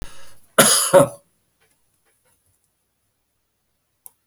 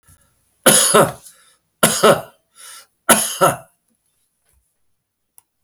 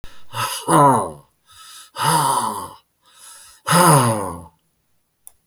{
  "cough_length": "4.3 s",
  "cough_amplitude": 32768,
  "cough_signal_mean_std_ratio": 0.27,
  "three_cough_length": "5.6 s",
  "three_cough_amplitude": 32768,
  "three_cough_signal_mean_std_ratio": 0.35,
  "exhalation_length": "5.5 s",
  "exhalation_amplitude": 31545,
  "exhalation_signal_mean_std_ratio": 0.49,
  "survey_phase": "beta (2021-08-13 to 2022-03-07)",
  "age": "65+",
  "gender": "Male",
  "wearing_mask": "No",
  "symptom_none": true,
  "smoker_status": "Never smoked",
  "respiratory_condition_asthma": false,
  "respiratory_condition_other": false,
  "recruitment_source": "REACT",
  "submission_delay": "4 days",
  "covid_test_result": "Negative",
  "covid_test_method": "RT-qPCR"
}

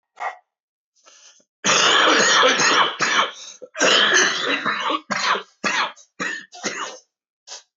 {
  "cough_length": "7.8 s",
  "cough_amplitude": 19581,
  "cough_signal_mean_std_ratio": 0.61,
  "survey_phase": "beta (2021-08-13 to 2022-03-07)",
  "age": "45-64",
  "gender": "Male",
  "wearing_mask": "No",
  "symptom_cough_any": true,
  "symptom_runny_or_blocked_nose": true,
  "symptom_shortness_of_breath": true,
  "symptom_sore_throat": true,
  "symptom_fatigue": true,
  "symptom_fever_high_temperature": true,
  "symptom_headache": true,
  "symptom_change_to_sense_of_smell_or_taste": true,
  "symptom_loss_of_taste": true,
  "symptom_onset": "5 days",
  "smoker_status": "Never smoked",
  "respiratory_condition_asthma": false,
  "respiratory_condition_other": false,
  "recruitment_source": "REACT",
  "submission_delay": "1 day",
  "covid_test_result": "Negative",
  "covid_test_method": "RT-qPCR",
  "influenza_a_test_result": "Negative",
  "influenza_b_test_result": "Negative"
}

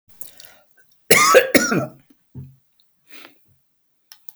{
  "cough_length": "4.4 s",
  "cough_amplitude": 32768,
  "cough_signal_mean_std_ratio": 0.32,
  "survey_phase": "beta (2021-08-13 to 2022-03-07)",
  "age": "65+",
  "gender": "Male",
  "wearing_mask": "No",
  "symptom_none": true,
  "smoker_status": "Never smoked",
  "respiratory_condition_asthma": false,
  "respiratory_condition_other": false,
  "recruitment_source": "REACT",
  "submission_delay": "1 day",
  "covid_test_result": "Negative",
  "covid_test_method": "RT-qPCR"
}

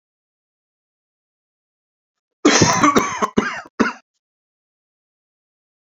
{
  "cough_length": "6.0 s",
  "cough_amplitude": 29221,
  "cough_signal_mean_std_ratio": 0.31,
  "survey_phase": "beta (2021-08-13 to 2022-03-07)",
  "age": "45-64",
  "gender": "Male",
  "wearing_mask": "No",
  "symptom_shortness_of_breath": true,
  "symptom_fatigue": true,
  "smoker_status": "Ex-smoker",
  "respiratory_condition_asthma": false,
  "respiratory_condition_other": false,
  "recruitment_source": "REACT",
  "submission_delay": "3 days",
  "covid_test_result": "Negative",
  "covid_test_method": "RT-qPCR"
}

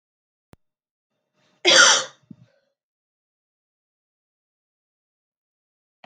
{
  "cough_length": "6.1 s",
  "cough_amplitude": 32767,
  "cough_signal_mean_std_ratio": 0.2,
  "survey_phase": "beta (2021-08-13 to 2022-03-07)",
  "age": "18-44",
  "gender": "Female",
  "wearing_mask": "No",
  "symptom_cough_any": true,
  "symptom_runny_or_blocked_nose": true,
  "symptom_loss_of_taste": true,
  "symptom_onset": "3 days",
  "smoker_status": "Never smoked",
  "respiratory_condition_asthma": false,
  "respiratory_condition_other": false,
  "recruitment_source": "Test and Trace",
  "submission_delay": "2 days",
  "covid_test_result": "Positive",
  "covid_test_method": "RT-qPCR",
  "covid_ct_value": 15.7,
  "covid_ct_gene": "ORF1ab gene",
  "covid_ct_mean": 16.0,
  "covid_viral_load": "5600000 copies/ml",
  "covid_viral_load_category": "High viral load (>1M copies/ml)"
}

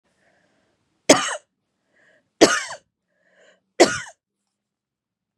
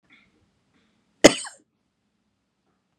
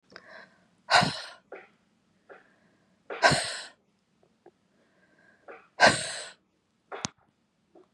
{
  "three_cough_length": "5.4 s",
  "three_cough_amplitude": 32767,
  "three_cough_signal_mean_std_ratio": 0.22,
  "cough_length": "3.0 s",
  "cough_amplitude": 32768,
  "cough_signal_mean_std_ratio": 0.12,
  "exhalation_length": "7.9 s",
  "exhalation_amplitude": 18403,
  "exhalation_signal_mean_std_ratio": 0.27,
  "survey_phase": "beta (2021-08-13 to 2022-03-07)",
  "age": "45-64",
  "gender": "Female",
  "wearing_mask": "No",
  "symptom_cough_any": true,
  "symptom_headache": true,
  "smoker_status": "Never smoked",
  "respiratory_condition_asthma": false,
  "respiratory_condition_other": false,
  "recruitment_source": "Test and Trace",
  "submission_delay": "2 days",
  "covid_test_result": "Positive",
  "covid_test_method": "RT-qPCR",
  "covid_ct_value": 28.8,
  "covid_ct_gene": "ORF1ab gene",
  "covid_ct_mean": 28.8,
  "covid_viral_load": "360 copies/ml",
  "covid_viral_load_category": "Minimal viral load (< 10K copies/ml)"
}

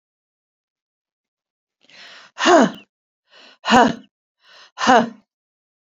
{
  "exhalation_length": "5.8 s",
  "exhalation_amplitude": 28371,
  "exhalation_signal_mean_std_ratio": 0.29,
  "survey_phase": "beta (2021-08-13 to 2022-03-07)",
  "age": "45-64",
  "gender": "Female",
  "wearing_mask": "No",
  "symptom_none": true,
  "smoker_status": "Never smoked",
  "respiratory_condition_asthma": false,
  "respiratory_condition_other": false,
  "recruitment_source": "REACT",
  "submission_delay": "2 days",
  "covid_test_result": "Negative",
  "covid_test_method": "RT-qPCR",
  "influenza_a_test_result": "Negative",
  "influenza_b_test_result": "Negative"
}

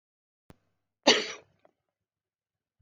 {
  "cough_length": "2.8 s",
  "cough_amplitude": 14627,
  "cough_signal_mean_std_ratio": 0.19,
  "survey_phase": "beta (2021-08-13 to 2022-03-07)",
  "age": "65+",
  "gender": "Female",
  "wearing_mask": "No",
  "symptom_none": true,
  "smoker_status": "Ex-smoker",
  "respiratory_condition_asthma": false,
  "respiratory_condition_other": false,
  "recruitment_source": "REACT",
  "submission_delay": "1 day",
  "covid_test_result": "Negative",
  "covid_test_method": "RT-qPCR"
}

